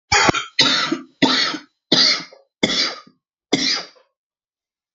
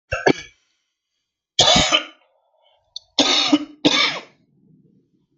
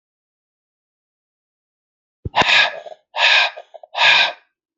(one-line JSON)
{"cough_length": "4.9 s", "cough_amplitude": 30335, "cough_signal_mean_std_ratio": 0.51, "three_cough_length": "5.4 s", "three_cough_amplitude": 29644, "three_cough_signal_mean_std_ratio": 0.4, "exhalation_length": "4.8 s", "exhalation_amplitude": 28804, "exhalation_signal_mean_std_ratio": 0.39, "survey_phase": "beta (2021-08-13 to 2022-03-07)", "age": "45-64", "gender": "Male", "wearing_mask": "Yes", "symptom_cough_any": true, "symptom_shortness_of_breath": true, "symptom_sore_throat": true, "symptom_change_to_sense_of_smell_or_taste": true, "symptom_onset": "10 days", "smoker_status": "Never smoked", "respiratory_condition_asthma": false, "respiratory_condition_other": false, "recruitment_source": "Test and Trace", "submission_delay": "2 days", "covid_test_result": "Positive", "covid_test_method": "RT-qPCR"}